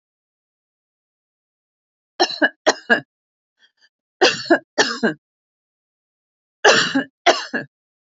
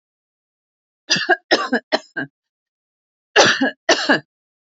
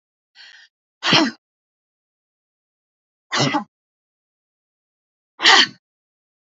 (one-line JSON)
{"three_cough_length": "8.2 s", "three_cough_amplitude": 32767, "three_cough_signal_mean_std_ratio": 0.31, "cough_length": "4.8 s", "cough_amplitude": 30361, "cough_signal_mean_std_ratio": 0.37, "exhalation_length": "6.5 s", "exhalation_amplitude": 31453, "exhalation_signal_mean_std_ratio": 0.26, "survey_phase": "alpha (2021-03-01 to 2021-08-12)", "age": "65+", "gender": "Female", "wearing_mask": "No", "symptom_none": true, "smoker_status": "Never smoked", "respiratory_condition_asthma": false, "respiratory_condition_other": false, "recruitment_source": "REACT", "submission_delay": "3 days", "covid_test_result": "Negative", "covid_test_method": "RT-qPCR"}